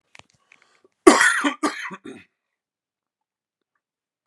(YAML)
cough_length: 4.3 s
cough_amplitude: 32768
cough_signal_mean_std_ratio: 0.26
survey_phase: beta (2021-08-13 to 2022-03-07)
age: 45-64
gender: Male
wearing_mask: 'No'
symptom_cough_any: true
symptom_sore_throat: true
symptom_diarrhoea: true
symptom_fatigue: true
symptom_headache: true
symptom_change_to_sense_of_smell_or_taste: true
symptom_onset: 2 days
smoker_status: Current smoker (e-cigarettes or vapes only)
respiratory_condition_asthma: false
respiratory_condition_other: false
recruitment_source: Test and Trace
submission_delay: 1 day
covid_test_result: Positive
covid_test_method: ePCR